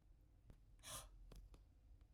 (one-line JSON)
{"exhalation_length": "2.1 s", "exhalation_amplitude": 364, "exhalation_signal_mean_std_ratio": 0.85, "survey_phase": "alpha (2021-03-01 to 2021-08-12)", "age": "45-64", "gender": "Male", "wearing_mask": "No", "symptom_none": true, "smoker_status": "Never smoked", "respiratory_condition_asthma": false, "respiratory_condition_other": false, "recruitment_source": "REACT", "submission_delay": "3 days", "covid_test_result": "Negative", "covid_test_method": "RT-qPCR"}